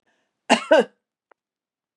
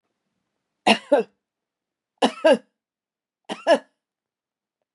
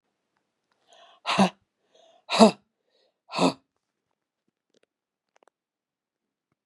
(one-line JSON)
{"cough_length": "2.0 s", "cough_amplitude": 29314, "cough_signal_mean_std_ratio": 0.27, "three_cough_length": "4.9 s", "three_cough_amplitude": 24312, "three_cough_signal_mean_std_ratio": 0.26, "exhalation_length": "6.7 s", "exhalation_amplitude": 30142, "exhalation_signal_mean_std_ratio": 0.2, "survey_phase": "beta (2021-08-13 to 2022-03-07)", "age": "45-64", "gender": "Female", "wearing_mask": "No", "symptom_none": true, "smoker_status": "Ex-smoker", "respiratory_condition_asthma": false, "respiratory_condition_other": false, "recruitment_source": "REACT", "submission_delay": "1 day", "covid_test_result": "Negative", "covid_test_method": "RT-qPCR", "influenza_a_test_result": "Negative", "influenza_b_test_result": "Negative"}